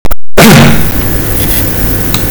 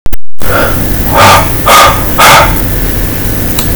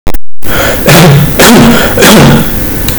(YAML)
cough_length: 2.3 s
cough_amplitude: 32768
cough_signal_mean_std_ratio: 1.3
exhalation_length: 3.8 s
exhalation_amplitude: 32768
exhalation_signal_mean_std_ratio: 1.28
three_cough_length: 3.0 s
three_cough_amplitude: 32768
three_cough_signal_mean_std_ratio: 1.62
survey_phase: beta (2021-08-13 to 2022-03-07)
age: 18-44
gender: Male
wearing_mask: 'No'
symptom_none: true
smoker_status: Ex-smoker
respiratory_condition_asthma: false
respiratory_condition_other: false
recruitment_source: REACT
submission_delay: 2 days
covid_test_result: Negative
covid_test_method: RT-qPCR